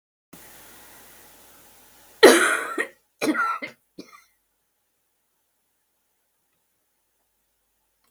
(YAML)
cough_length: 8.1 s
cough_amplitude: 32767
cough_signal_mean_std_ratio: 0.23
survey_phase: beta (2021-08-13 to 2022-03-07)
age: 65+
gender: Female
wearing_mask: 'No'
symptom_none: true
smoker_status: Never smoked
respiratory_condition_asthma: false
respiratory_condition_other: false
recruitment_source: REACT
submission_delay: 1 day
covid_test_result: Negative
covid_test_method: RT-qPCR
influenza_a_test_result: Negative
influenza_b_test_result: Negative